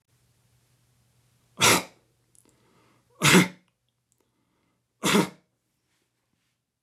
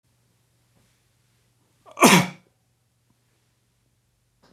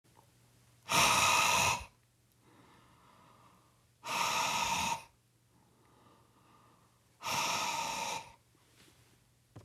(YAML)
three_cough_length: 6.8 s
three_cough_amplitude: 18772
three_cough_signal_mean_std_ratio: 0.25
cough_length: 4.5 s
cough_amplitude: 31727
cough_signal_mean_std_ratio: 0.19
exhalation_length: 9.6 s
exhalation_amplitude: 6108
exhalation_signal_mean_std_ratio: 0.46
survey_phase: beta (2021-08-13 to 2022-03-07)
age: 45-64
gender: Male
wearing_mask: 'No'
symptom_sore_throat: true
symptom_onset: 4 days
smoker_status: Ex-smoker
respiratory_condition_asthma: false
respiratory_condition_other: false
recruitment_source: REACT
submission_delay: 1 day
covid_test_result: Positive
covid_test_method: RT-qPCR
covid_ct_value: 22.0
covid_ct_gene: E gene
influenza_a_test_result: Unknown/Void
influenza_b_test_result: Unknown/Void